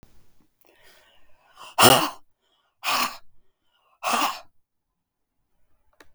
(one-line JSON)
{"exhalation_length": "6.1 s", "exhalation_amplitude": 32766, "exhalation_signal_mean_std_ratio": 0.28, "survey_phase": "beta (2021-08-13 to 2022-03-07)", "age": "65+", "gender": "Female", "wearing_mask": "No", "symptom_runny_or_blocked_nose": true, "smoker_status": "Never smoked", "respiratory_condition_asthma": false, "respiratory_condition_other": false, "recruitment_source": "Test and Trace", "submission_delay": "0 days", "covid_test_result": "Negative", "covid_test_method": "LFT"}